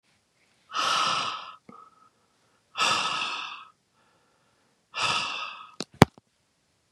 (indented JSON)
{
  "exhalation_length": "6.9 s",
  "exhalation_amplitude": 32768,
  "exhalation_signal_mean_std_ratio": 0.37,
  "survey_phase": "beta (2021-08-13 to 2022-03-07)",
  "age": "45-64",
  "gender": "Male",
  "wearing_mask": "No",
  "symptom_none": true,
  "symptom_onset": "8 days",
  "smoker_status": "Ex-smoker",
  "respiratory_condition_asthma": false,
  "respiratory_condition_other": false,
  "recruitment_source": "REACT",
  "submission_delay": "1 day",
  "covid_test_result": "Negative",
  "covid_test_method": "RT-qPCR",
  "influenza_a_test_result": "Negative",
  "influenza_b_test_result": "Negative"
}